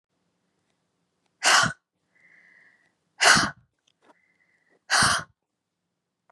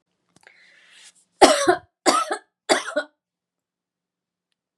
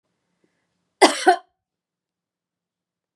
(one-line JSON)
{"exhalation_length": "6.3 s", "exhalation_amplitude": 19359, "exhalation_signal_mean_std_ratio": 0.29, "three_cough_length": "4.8 s", "three_cough_amplitude": 32767, "three_cough_signal_mean_std_ratio": 0.29, "cough_length": "3.2 s", "cough_amplitude": 32006, "cough_signal_mean_std_ratio": 0.2, "survey_phase": "beta (2021-08-13 to 2022-03-07)", "age": "45-64", "gender": "Female", "wearing_mask": "No", "symptom_cough_any": true, "symptom_runny_or_blocked_nose": true, "symptom_sore_throat": true, "symptom_fatigue": true, "symptom_fever_high_temperature": true, "symptom_change_to_sense_of_smell_or_taste": true, "symptom_other": true, "symptom_onset": "6 days", "smoker_status": "Never smoked", "respiratory_condition_asthma": false, "respiratory_condition_other": false, "recruitment_source": "Test and Trace", "submission_delay": "1 day", "covid_test_result": "Positive", "covid_test_method": "RT-qPCR", "covid_ct_value": 19.7, "covid_ct_gene": "N gene"}